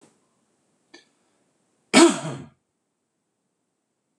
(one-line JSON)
{"cough_length": "4.2 s", "cough_amplitude": 25994, "cough_signal_mean_std_ratio": 0.2, "survey_phase": "beta (2021-08-13 to 2022-03-07)", "age": "45-64", "gender": "Male", "wearing_mask": "No", "symptom_none": true, "smoker_status": "Ex-smoker", "respiratory_condition_asthma": false, "respiratory_condition_other": false, "recruitment_source": "REACT", "submission_delay": "2 days", "covid_test_result": "Negative", "covid_test_method": "RT-qPCR", "influenza_a_test_result": "Negative", "influenza_b_test_result": "Negative"}